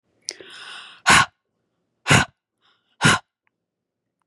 {"exhalation_length": "4.3 s", "exhalation_amplitude": 30350, "exhalation_signal_mean_std_ratio": 0.29, "survey_phase": "beta (2021-08-13 to 2022-03-07)", "age": "18-44", "gender": "Female", "wearing_mask": "No", "symptom_none": true, "smoker_status": "Never smoked", "respiratory_condition_asthma": false, "respiratory_condition_other": false, "recruitment_source": "REACT", "submission_delay": "3 days", "covid_test_result": "Negative", "covid_test_method": "RT-qPCR", "influenza_a_test_result": "Negative", "influenza_b_test_result": "Negative"}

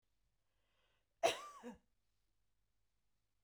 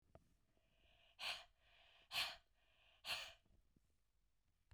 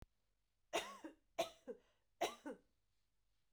{"cough_length": "3.4 s", "cough_amplitude": 2766, "cough_signal_mean_std_ratio": 0.2, "exhalation_length": "4.7 s", "exhalation_amplitude": 967, "exhalation_signal_mean_std_ratio": 0.34, "three_cough_length": "3.5 s", "three_cough_amplitude": 1427, "three_cough_signal_mean_std_ratio": 0.32, "survey_phase": "beta (2021-08-13 to 2022-03-07)", "age": "18-44", "gender": "Female", "wearing_mask": "No", "symptom_none": true, "smoker_status": "Never smoked", "respiratory_condition_asthma": false, "respiratory_condition_other": false, "recruitment_source": "REACT", "submission_delay": "1 day", "covid_test_result": "Negative", "covid_test_method": "RT-qPCR"}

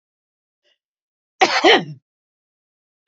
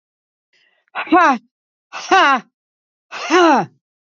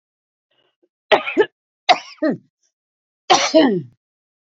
{"cough_length": "3.1 s", "cough_amplitude": 28042, "cough_signal_mean_std_ratio": 0.27, "exhalation_length": "4.1 s", "exhalation_amplitude": 29640, "exhalation_signal_mean_std_ratio": 0.41, "three_cough_length": "4.5 s", "three_cough_amplitude": 32767, "three_cough_signal_mean_std_ratio": 0.35, "survey_phase": "beta (2021-08-13 to 2022-03-07)", "age": "65+", "gender": "Female", "wearing_mask": "No", "symptom_none": true, "smoker_status": "Ex-smoker", "respiratory_condition_asthma": false, "respiratory_condition_other": false, "recruitment_source": "REACT", "submission_delay": "1 day", "covid_test_result": "Negative", "covid_test_method": "RT-qPCR", "influenza_a_test_result": "Negative", "influenza_b_test_result": "Negative"}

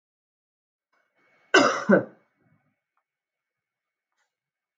{"cough_length": "4.8 s", "cough_amplitude": 22516, "cough_signal_mean_std_ratio": 0.22, "survey_phase": "beta (2021-08-13 to 2022-03-07)", "age": "45-64", "gender": "Female", "wearing_mask": "No", "symptom_runny_or_blocked_nose": true, "symptom_change_to_sense_of_smell_or_taste": true, "symptom_loss_of_taste": true, "smoker_status": "Never smoked", "respiratory_condition_asthma": false, "respiratory_condition_other": false, "recruitment_source": "Test and Trace", "submission_delay": "2 days", "covid_test_result": "Positive", "covid_test_method": "RT-qPCR", "covid_ct_value": 17.6, "covid_ct_gene": "ORF1ab gene", "covid_ct_mean": 18.0, "covid_viral_load": "1200000 copies/ml", "covid_viral_load_category": "High viral load (>1M copies/ml)"}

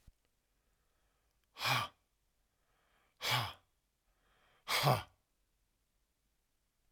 {"exhalation_length": "6.9 s", "exhalation_amplitude": 4790, "exhalation_signal_mean_std_ratio": 0.28, "survey_phase": "alpha (2021-03-01 to 2021-08-12)", "age": "65+", "gender": "Male", "wearing_mask": "No", "symptom_none": true, "smoker_status": "Never smoked", "respiratory_condition_asthma": false, "respiratory_condition_other": false, "recruitment_source": "REACT", "submission_delay": "2 days", "covid_test_result": "Negative", "covid_test_method": "RT-qPCR"}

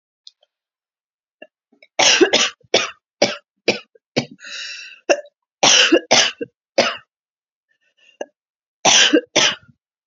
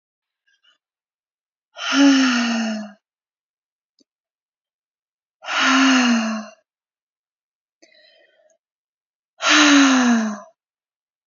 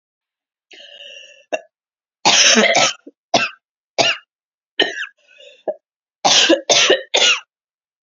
{"three_cough_length": "10.1 s", "three_cough_amplitude": 32767, "three_cough_signal_mean_std_ratio": 0.38, "exhalation_length": "11.3 s", "exhalation_amplitude": 27119, "exhalation_signal_mean_std_ratio": 0.43, "cough_length": "8.0 s", "cough_amplitude": 32768, "cough_signal_mean_std_ratio": 0.43, "survey_phase": "beta (2021-08-13 to 2022-03-07)", "age": "18-44", "gender": "Female", "wearing_mask": "No", "symptom_none": true, "symptom_onset": "2 days", "smoker_status": "Never smoked", "respiratory_condition_asthma": false, "respiratory_condition_other": false, "recruitment_source": "REACT", "submission_delay": "1 day", "covid_test_result": "Negative", "covid_test_method": "RT-qPCR"}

